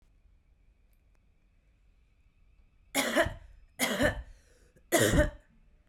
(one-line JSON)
{"three_cough_length": "5.9 s", "three_cough_amplitude": 9403, "three_cough_signal_mean_std_ratio": 0.36, "survey_phase": "beta (2021-08-13 to 2022-03-07)", "age": "45-64", "gender": "Female", "wearing_mask": "No", "symptom_prefer_not_to_say": true, "symptom_onset": "3 days", "smoker_status": "Ex-smoker", "respiratory_condition_asthma": false, "respiratory_condition_other": false, "recruitment_source": "Test and Trace", "submission_delay": "1 day", "covid_test_result": "Positive", "covid_test_method": "RT-qPCR", "covid_ct_value": 30.0, "covid_ct_gene": "N gene", "covid_ct_mean": 30.0, "covid_viral_load": "140 copies/ml", "covid_viral_load_category": "Minimal viral load (< 10K copies/ml)"}